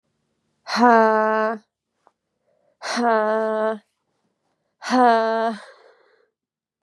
{"exhalation_length": "6.8 s", "exhalation_amplitude": 28752, "exhalation_signal_mean_std_ratio": 0.43, "survey_phase": "beta (2021-08-13 to 2022-03-07)", "age": "18-44", "gender": "Female", "wearing_mask": "Yes", "symptom_cough_any": true, "symptom_runny_or_blocked_nose": true, "symptom_sore_throat": true, "symptom_onset": "7 days", "smoker_status": "Never smoked", "respiratory_condition_asthma": false, "respiratory_condition_other": false, "recruitment_source": "Test and Trace", "submission_delay": "2 days", "covid_test_result": "Positive", "covid_test_method": "RT-qPCR", "covid_ct_value": 25.3, "covid_ct_gene": "ORF1ab gene"}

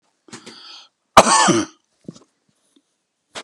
{"cough_length": "3.4 s", "cough_amplitude": 32768, "cough_signal_mean_std_ratio": 0.28, "survey_phase": "beta (2021-08-13 to 2022-03-07)", "age": "65+", "gender": "Male", "wearing_mask": "No", "symptom_none": true, "smoker_status": "Ex-smoker", "respiratory_condition_asthma": false, "respiratory_condition_other": false, "recruitment_source": "REACT", "submission_delay": "2 days", "covid_test_result": "Negative", "covid_test_method": "RT-qPCR", "influenza_a_test_result": "Negative", "influenza_b_test_result": "Negative"}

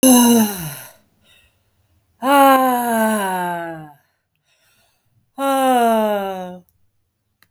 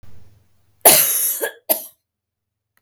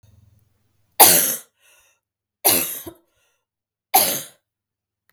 {"exhalation_length": "7.5 s", "exhalation_amplitude": 32766, "exhalation_signal_mean_std_ratio": 0.56, "cough_length": "2.8 s", "cough_amplitude": 32768, "cough_signal_mean_std_ratio": 0.38, "three_cough_length": "5.1 s", "three_cough_amplitude": 32768, "three_cough_signal_mean_std_ratio": 0.3, "survey_phase": "beta (2021-08-13 to 2022-03-07)", "age": "18-44", "gender": "Female", "wearing_mask": "No", "symptom_cough_any": true, "symptom_change_to_sense_of_smell_or_taste": true, "symptom_loss_of_taste": true, "symptom_other": true, "symptom_onset": "3 days", "smoker_status": "Ex-smoker", "respiratory_condition_asthma": false, "respiratory_condition_other": false, "recruitment_source": "Test and Trace", "submission_delay": "2 days", "covid_test_result": "Positive", "covid_test_method": "RT-qPCR", "covid_ct_value": 25.4, "covid_ct_gene": "ORF1ab gene", "covid_ct_mean": 26.4, "covid_viral_load": "2200 copies/ml", "covid_viral_load_category": "Minimal viral load (< 10K copies/ml)"}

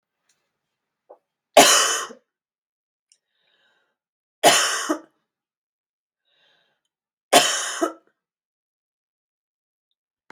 {"three_cough_length": "10.3 s", "three_cough_amplitude": 32768, "three_cough_signal_mean_std_ratio": 0.26, "survey_phase": "beta (2021-08-13 to 2022-03-07)", "age": "45-64", "gender": "Female", "wearing_mask": "No", "symptom_cough_any": true, "symptom_runny_or_blocked_nose": true, "symptom_onset": "3 days", "smoker_status": "Never smoked", "respiratory_condition_asthma": true, "respiratory_condition_other": false, "recruitment_source": "Test and Trace", "submission_delay": "1 day", "covid_test_result": "Positive", "covid_test_method": "RT-qPCR", "covid_ct_value": 30.9, "covid_ct_gene": "N gene"}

